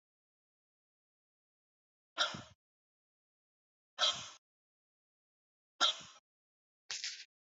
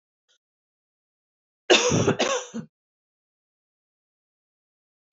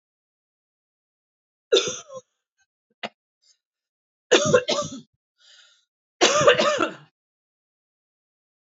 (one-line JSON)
{"exhalation_length": "7.6 s", "exhalation_amplitude": 5337, "exhalation_signal_mean_std_ratio": 0.23, "cough_length": "5.1 s", "cough_amplitude": 22648, "cough_signal_mean_std_ratio": 0.28, "three_cough_length": "8.7 s", "three_cough_amplitude": 24663, "three_cough_signal_mean_std_ratio": 0.3, "survey_phase": "beta (2021-08-13 to 2022-03-07)", "age": "45-64", "gender": "Female", "wearing_mask": "No", "symptom_none": true, "smoker_status": "Never smoked", "respiratory_condition_asthma": false, "respiratory_condition_other": false, "recruitment_source": "REACT", "submission_delay": "1 day", "covid_test_result": "Negative", "covid_test_method": "RT-qPCR", "influenza_a_test_result": "Negative", "influenza_b_test_result": "Negative"}